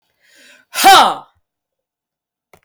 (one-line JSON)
{"exhalation_length": "2.6 s", "exhalation_amplitude": 32767, "exhalation_signal_mean_std_ratio": 0.31, "survey_phase": "beta (2021-08-13 to 2022-03-07)", "age": "65+", "gender": "Female", "wearing_mask": "No", "symptom_none": true, "smoker_status": "Never smoked", "respiratory_condition_asthma": false, "respiratory_condition_other": false, "recruitment_source": "REACT", "submission_delay": "1 day", "covid_test_result": "Negative", "covid_test_method": "RT-qPCR"}